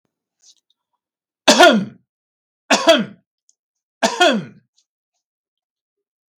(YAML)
three_cough_length: 6.4 s
three_cough_amplitude: 32768
three_cough_signal_mean_std_ratio: 0.3
survey_phase: beta (2021-08-13 to 2022-03-07)
age: 65+
gender: Male
wearing_mask: 'No'
symptom_none: true
smoker_status: Never smoked
respiratory_condition_asthma: false
respiratory_condition_other: false
recruitment_source: REACT
submission_delay: 3 days
covid_test_result: Negative
covid_test_method: RT-qPCR
influenza_a_test_result: Unknown/Void
influenza_b_test_result: Unknown/Void